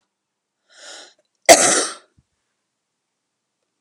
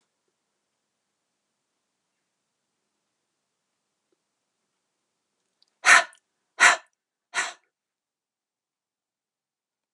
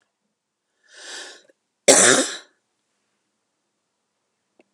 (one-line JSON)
{"cough_length": "3.8 s", "cough_amplitude": 32768, "cough_signal_mean_std_ratio": 0.23, "exhalation_length": "9.9 s", "exhalation_amplitude": 28014, "exhalation_signal_mean_std_ratio": 0.15, "three_cough_length": "4.7 s", "three_cough_amplitude": 32768, "three_cough_signal_mean_std_ratio": 0.24, "survey_phase": "alpha (2021-03-01 to 2021-08-12)", "age": "45-64", "gender": "Female", "wearing_mask": "No", "symptom_none": true, "symptom_onset": "12 days", "smoker_status": "Ex-smoker", "respiratory_condition_asthma": false, "respiratory_condition_other": false, "recruitment_source": "REACT", "submission_delay": "3 days", "covid_test_result": "Negative", "covid_test_method": "RT-qPCR"}